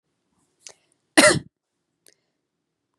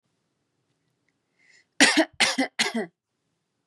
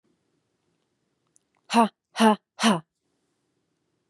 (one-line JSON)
{"cough_length": "3.0 s", "cough_amplitude": 32756, "cough_signal_mean_std_ratio": 0.2, "three_cough_length": "3.7 s", "three_cough_amplitude": 29799, "three_cough_signal_mean_std_ratio": 0.32, "exhalation_length": "4.1 s", "exhalation_amplitude": 19810, "exhalation_signal_mean_std_ratio": 0.26, "survey_phase": "beta (2021-08-13 to 2022-03-07)", "age": "18-44", "gender": "Female", "wearing_mask": "No", "symptom_cough_any": true, "symptom_new_continuous_cough": true, "symptom_other": true, "smoker_status": "Never smoked", "respiratory_condition_asthma": false, "respiratory_condition_other": false, "recruitment_source": "Test and Trace", "submission_delay": "2 days", "covid_test_result": "Positive", "covid_test_method": "ePCR"}